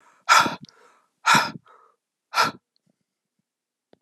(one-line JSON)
{"exhalation_length": "4.0 s", "exhalation_amplitude": 26937, "exhalation_signal_mean_std_ratio": 0.3, "survey_phase": "alpha (2021-03-01 to 2021-08-12)", "age": "45-64", "gender": "Female", "wearing_mask": "No", "symptom_cough_any": true, "symptom_shortness_of_breath": true, "symptom_fatigue": true, "symptom_fever_high_temperature": true, "symptom_change_to_sense_of_smell_or_taste": true, "symptom_loss_of_taste": true, "symptom_onset": "6 days", "smoker_status": "Never smoked", "respiratory_condition_asthma": false, "respiratory_condition_other": false, "recruitment_source": "Test and Trace", "submission_delay": "2 days", "covid_test_result": "Positive", "covid_test_method": "RT-qPCR", "covid_ct_value": 17.7, "covid_ct_gene": "N gene", "covid_ct_mean": 17.7, "covid_viral_load": "1600000 copies/ml", "covid_viral_load_category": "High viral load (>1M copies/ml)"}